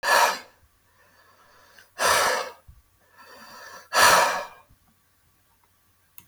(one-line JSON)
{"exhalation_length": "6.3 s", "exhalation_amplitude": 20571, "exhalation_signal_mean_std_ratio": 0.38, "survey_phase": "beta (2021-08-13 to 2022-03-07)", "age": "45-64", "gender": "Male", "wearing_mask": "No", "symptom_none": true, "smoker_status": "Never smoked", "respiratory_condition_asthma": false, "respiratory_condition_other": false, "recruitment_source": "REACT", "submission_delay": "0 days", "covid_test_result": "Negative", "covid_test_method": "RT-qPCR", "influenza_a_test_result": "Unknown/Void", "influenza_b_test_result": "Unknown/Void"}